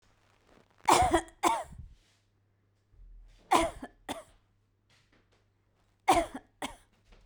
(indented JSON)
{
  "three_cough_length": "7.3 s",
  "three_cough_amplitude": 11691,
  "three_cough_signal_mean_std_ratio": 0.31,
  "survey_phase": "beta (2021-08-13 to 2022-03-07)",
  "age": "45-64",
  "gender": "Female",
  "wearing_mask": "No",
  "symptom_none": true,
  "smoker_status": "Never smoked",
  "respiratory_condition_asthma": false,
  "respiratory_condition_other": false,
  "recruitment_source": "REACT",
  "submission_delay": "2 days",
  "covid_test_result": "Negative",
  "covid_test_method": "RT-qPCR"
}